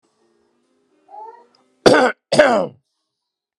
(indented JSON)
{
  "cough_length": "3.6 s",
  "cough_amplitude": 32768,
  "cough_signal_mean_std_ratio": 0.32,
  "survey_phase": "beta (2021-08-13 to 2022-03-07)",
  "age": "18-44",
  "gender": "Male",
  "wearing_mask": "No",
  "symptom_none": true,
  "smoker_status": "Ex-smoker",
  "respiratory_condition_asthma": true,
  "respiratory_condition_other": false,
  "recruitment_source": "REACT",
  "submission_delay": "1 day",
  "covid_test_result": "Negative",
  "covid_test_method": "RT-qPCR"
}